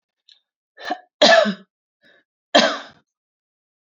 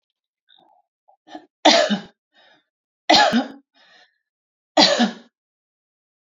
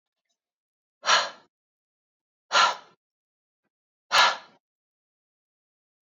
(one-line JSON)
{"cough_length": "3.8 s", "cough_amplitude": 29494, "cough_signal_mean_std_ratio": 0.3, "three_cough_length": "6.3 s", "three_cough_amplitude": 32768, "three_cough_signal_mean_std_ratio": 0.32, "exhalation_length": "6.1 s", "exhalation_amplitude": 19562, "exhalation_signal_mean_std_ratio": 0.26, "survey_phase": "alpha (2021-03-01 to 2021-08-12)", "age": "18-44", "gender": "Female", "wearing_mask": "No", "symptom_abdominal_pain": true, "symptom_diarrhoea": true, "symptom_fatigue": true, "symptom_fever_high_temperature": true, "symptom_headache": true, "symptom_onset": "5 days", "smoker_status": "Ex-smoker", "respiratory_condition_asthma": false, "respiratory_condition_other": false, "recruitment_source": "Test and Trace", "submission_delay": "2 days", "covid_test_result": "Positive", "covid_test_method": "RT-qPCR", "covid_ct_value": 34.8, "covid_ct_gene": "ORF1ab gene"}